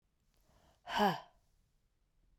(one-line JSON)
{"exhalation_length": "2.4 s", "exhalation_amplitude": 3614, "exhalation_signal_mean_std_ratio": 0.28, "survey_phase": "beta (2021-08-13 to 2022-03-07)", "age": "45-64", "gender": "Female", "wearing_mask": "No", "symptom_cough_any": true, "symptom_runny_or_blocked_nose": true, "symptom_sore_throat": true, "symptom_fatigue": true, "symptom_headache": true, "symptom_onset": "4 days", "smoker_status": "Never smoked", "respiratory_condition_asthma": false, "respiratory_condition_other": false, "recruitment_source": "Test and Trace", "submission_delay": "2 days", "covid_test_result": "Positive", "covid_test_method": "RT-qPCR", "covid_ct_value": 10.7, "covid_ct_gene": "ORF1ab gene"}